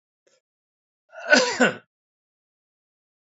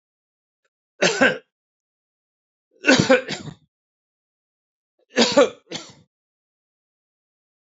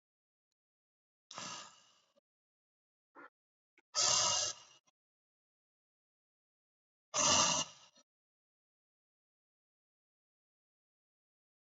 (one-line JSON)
{"cough_length": "3.3 s", "cough_amplitude": 31681, "cough_signal_mean_std_ratio": 0.26, "three_cough_length": "7.8 s", "three_cough_amplitude": 27319, "three_cough_signal_mean_std_ratio": 0.27, "exhalation_length": "11.7 s", "exhalation_amplitude": 4758, "exhalation_signal_mean_std_ratio": 0.26, "survey_phase": "beta (2021-08-13 to 2022-03-07)", "age": "65+", "gender": "Male", "wearing_mask": "No", "symptom_change_to_sense_of_smell_or_taste": true, "symptom_onset": "7 days", "smoker_status": "Ex-smoker", "respiratory_condition_asthma": false, "respiratory_condition_other": false, "recruitment_source": "Test and Trace", "submission_delay": "1 day", "covid_test_result": "Positive", "covid_test_method": "RT-qPCR", "covid_ct_value": 19.8, "covid_ct_gene": "ORF1ab gene"}